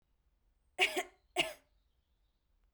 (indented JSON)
{
  "cough_length": "2.7 s",
  "cough_amplitude": 5237,
  "cough_signal_mean_std_ratio": 0.27,
  "survey_phase": "beta (2021-08-13 to 2022-03-07)",
  "age": "18-44",
  "gender": "Female",
  "wearing_mask": "No",
  "symptom_none": true,
  "smoker_status": "Never smoked",
  "respiratory_condition_asthma": false,
  "respiratory_condition_other": false,
  "recruitment_source": "REACT",
  "submission_delay": "1 day",
  "covid_test_result": "Negative",
  "covid_test_method": "RT-qPCR"
}